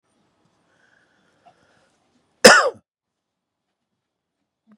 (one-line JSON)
{"cough_length": "4.8 s", "cough_amplitude": 32768, "cough_signal_mean_std_ratio": 0.17, "survey_phase": "beta (2021-08-13 to 2022-03-07)", "age": "45-64", "gender": "Male", "wearing_mask": "No", "symptom_none": true, "smoker_status": "Ex-smoker", "respiratory_condition_asthma": false, "respiratory_condition_other": false, "recruitment_source": "REACT", "submission_delay": "1 day", "covid_test_result": "Negative", "covid_test_method": "RT-qPCR", "influenza_a_test_result": "Negative", "influenza_b_test_result": "Negative"}